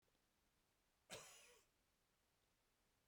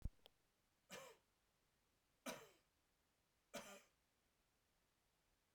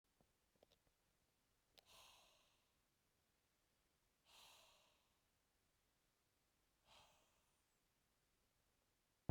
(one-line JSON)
{"cough_length": "3.1 s", "cough_amplitude": 1549, "cough_signal_mean_std_ratio": 0.23, "three_cough_length": "5.5 s", "three_cough_amplitude": 1069, "three_cough_signal_mean_std_ratio": 0.26, "exhalation_length": "9.3 s", "exhalation_amplitude": 952, "exhalation_signal_mean_std_ratio": 0.18, "survey_phase": "beta (2021-08-13 to 2022-03-07)", "age": "18-44", "gender": "Male", "wearing_mask": "No", "symptom_cough_any": true, "symptom_runny_or_blocked_nose": true, "symptom_fatigue": true, "symptom_headache": true, "symptom_change_to_sense_of_smell_or_taste": true, "symptom_onset": "2 days", "smoker_status": "Ex-smoker", "respiratory_condition_asthma": false, "respiratory_condition_other": false, "recruitment_source": "Test and Trace", "submission_delay": "2 days", "covid_test_result": "Positive", "covid_test_method": "RT-qPCR", "covid_ct_value": 16.0, "covid_ct_gene": "ORF1ab gene", "covid_ct_mean": 16.5, "covid_viral_load": "3700000 copies/ml", "covid_viral_load_category": "High viral load (>1M copies/ml)"}